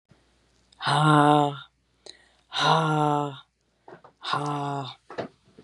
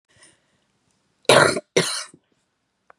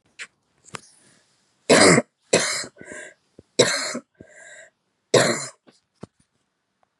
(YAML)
exhalation_length: 5.6 s
exhalation_amplitude: 19697
exhalation_signal_mean_std_ratio: 0.45
cough_length: 3.0 s
cough_amplitude: 32768
cough_signal_mean_std_ratio: 0.3
three_cough_length: 7.0 s
three_cough_amplitude: 30840
three_cough_signal_mean_std_ratio: 0.32
survey_phase: beta (2021-08-13 to 2022-03-07)
age: 45-64
gender: Female
wearing_mask: 'No'
symptom_cough_any: true
symptom_runny_or_blocked_nose: true
symptom_sore_throat: true
symptom_fatigue: true
symptom_headache: true
symptom_onset: 4 days
smoker_status: Never smoked
respiratory_condition_asthma: false
respiratory_condition_other: false
recruitment_source: Test and Trace
submission_delay: 2 days
covid_test_result: Positive
covid_test_method: RT-qPCR
covid_ct_value: 32.9
covid_ct_gene: ORF1ab gene
covid_ct_mean: 33.9
covid_viral_load: 7.4 copies/ml
covid_viral_load_category: Minimal viral load (< 10K copies/ml)